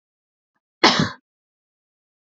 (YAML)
cough_length: 2.4 s
cough_amplitude: 30004
cough_signal_mean_std_ratio: 0.23
survey_phase: alpha (2021-03-01 to 2021-08-12)
age: 18-44
gender: Female
wearing_mask: 'No'
symptom_none: true
smoker_status: Current smoker (1 to 10 cigarettes per day)
respiratory_condition_asthma: false
respiratory_condition_other: false
recruitment_source: REACT
submission_delay: 2 days
covid_test_result: Negative
covid_test_method: RT-qPCR